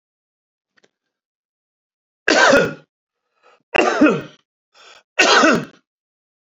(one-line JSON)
{"three_cough_length": "6.6 s", "three_cough_amplitude": 32767, "three_cough_signal_mean_std_ratio": 0.36, "survey_phase": "beta (2021-08-13 to 2022-03-07)", "age": "45-64", "gender": "Male", "wearing_mask": "Yes", "symptom_none": true, "smoker_status": "Ex-smoker", "respiratory_condition_asthma": false, "respiratory_condition_other": false, "recruitment_source": "REACT", "submission_delay": "2 days", "covid_test_result": "Negative", "covid_test_method": "RT-qPCR", "influenza_a_test_result": "Negative", "influenza_b_test_result": "Negative"}